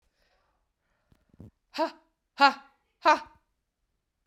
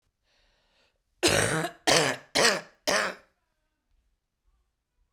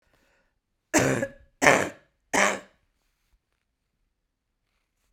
exhalation_length: 4.3 s
exhalation_amplitude: 15615
exhalation_signal_mean_std_ratio: 0.22
cough_length: 5.1 s
cough_amplitude: 19112
cough_signal_mean_std_ratio: 0.38
three_cough_length: 5.1 s
three_cough_amplitude: 31241
three_cough_signal_mean_std_ratio: 0.28
survey_phase: beta (2021-08-13 to 2022-03-07)
age: 18-44
gender: Female
wearing_mask: 'Yes'
symptom_runny_or_blocked_nose: true
symptom_shortness_of_breath: true
symptom_change_to_sense_of_smell_or_taste: true
symptom_loss_of_taste: true
symptom_onset: 3 days
smoker_status: Never smoked
respiratory_condition_asthma: false
respiratory_condition_other: false
recruitment_source: Test and Trace
submission_delay: 1 day
covid_test_result: Positive
covid_test_method: RT-qPCR
covid_ct_value: 16.3
covid_ct_gene: ORF1ab gene
covid_ct_mean: 16.5
covid_viral_load: 4000000 copies/ml
covid_viral_load_category: High viral load (>1M copies/ml)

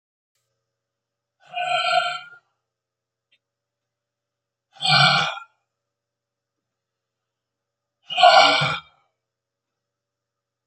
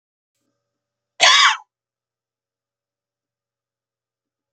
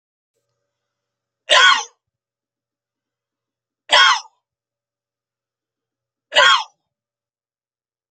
exhalation_length: 10.7 s
exhalation_amplitude: 27680
exhalation_signal_mean_std_ratio: 0.3
cough_length: 4.5 s
cough_amplitude: 30877
cough_signal_mean_std_ratio: 0.22
three_cough_length: 8.1 s
three_cough_amplitude: 32768
three_cough_signal_mean_std_ratio: 0.26
survey_phase: beta (2021-08-13 to 2022-03-07)
age: 65+
gender: Male
wearing_mask: 'No'
symptom_none: true
smoker_status: Ex-smoker
respiratory_condition_asthma: false
respiratory_condition_other: false
recruitment_source: REACT
submission_delay: 4 days
covid_test_result: Negative
covid_test_method: RT-qPCR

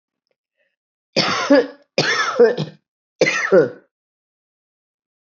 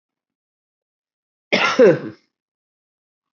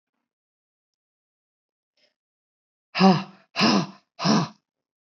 three_cough_length: 5.4 s
three_cough_amplitude: 25606
three_cough_signal_mean_std_ratio: 0.41
cough_length: 3.3 s
cough_amplitude: 24519
cough_signal_mean_std_ratio: 0.28
exhalation_length: 5.0 s
exhalation_amplitude: 20737
exhalation_signal_mean_std_ratio: 0.32
survey_phase: beta (2021-08-13 to 2022-03-07)
age: 45-64
gender: Female
wearing_mask: 'No'
symptom_cough_any: true
symptom_new_continuous_cough: true
symptom_runny_or_blocked_nose: true
symptom_abdominal_pain: true
symptom_change_to_sense_of_smell_or_taste: true
symptom_other: true
smoker_status: Current smoker (e-cigarettes or vapes only)
respiratory_condition_asthma: false
respiratory_condition_other: false
recruitment_source: Test and Trace
submission_delay: 5 days
covid_test_result: Positive
covid_test_method: ePCR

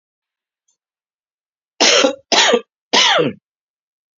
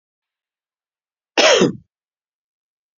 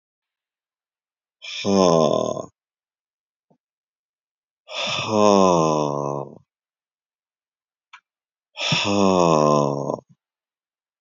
three_cough_length: 4.2 s
three_cough_amplitude: 32767
three_cough_signal_mean_std_ratio: 0.4
cough_length: 3.0 s
cough_amplitude: 32768
cough_signal_mean_std_ratio: 0.27
exhalation_length: 11.0 s
exhalation_amplitude: 27976
exhalation_signal_mean_std_ratio: 0.41
survey_phase: beta (2021-08-13 to 2022-03-07)
age: 45-64
gender: Male
wearing_mask: 'No'
symptom_cough_any: true
symptom_new_continuous_cough: true
symptom_abdominal_pain: true
symptom_fatigue: true
symptom_headache: true
smoker_status: Never smoked
respiratory_condition_asthma: false
respiratory_condition_other: false
recruitment_source: Test and Trace
submission_delay: 2 days
covid_test_result: Positive
covid_test_method: RT-qPCR
covid_ct_value: 22.9
covid_ct_gene: ORF1ab gene
covid_ct_mean: 23.2
covid_viral_load: 25000 copies/ml
covid_viral_load_category: Low viral load (10K-1M copies/ml)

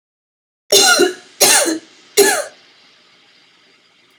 three_cough_length: 4.2 s
three_cough_amplitude: 32768
three_cough_signal_mean_std_ratio: 0.42
survey_phase: beta (2021-08-13 to 2022-03-07)
age: 18-44
gender: Female
wearing_mask: 'No'
symptom_new_continuous_cough: true
symptom_runny_or_blocked_nose: true
symptom_sore_throat: true
symptom_fever_high_temperature: true
symptom_headache: true
symptom_other: true
symptom_onset: 3 days
smoker_status: Never smoked
respiratory_condition_asthma: false
respiratory_condition_other: false
recruitment_source: Test and Trace
submission_delay: 1 day
covid_test_result: Positive
covid_test_method: RT-qPCR
covid_ct_value: 23.5
covid_ct_gene: ORF1ab gene
covid_ct_mean: 23.9
covid_viral_load: 14000 copies/ml
covid_viral_load_category: Low viral load (10K-1M copies/ml)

